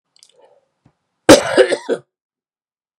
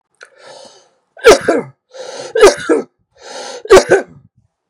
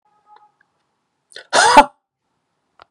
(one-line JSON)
{"cough_length": "3.0 s", "cough_amplitude": 32768, "cough_signal_mean_std_ratio": 0.28, "three_cough_length": "4.7 s", "three_cough_amplitude": 32768, "three_cough_signal_mean_std_ratio": 0.38, "exhalation_length": "2.9 s", "exhalation_amplitude": 32768, "exhalation_signal_mean_std_ratio": 0.25, "survey_phase": "beta (2021-08-13 to 2022-03-07)", "age": "45-64", "gender": "Male", "wearing_mask": "No", "symptom_cough_any": true, "symptom_runny_or_blocked_nose": true, "symptom_fatigue": true, "symptom_onset": "4 days", "smoker_status": "Ex-smoker", "respiratory_condition_asthma": false, "respiratory_condition_other": false, "recruitment_source": "Test and Trace", "submission_delay": "2 days", "covid_test_result": "Positive", "covid_test_method": "RT-qPCR", "covid_ct_value": 13.9, "covid_ct_gene": "S gene", "covid_ct_mean": 14.1, "covid_viral_load": "23000000 copies/ml", "covid_viral_load_category": "High viral load (>1M copies/ml)"}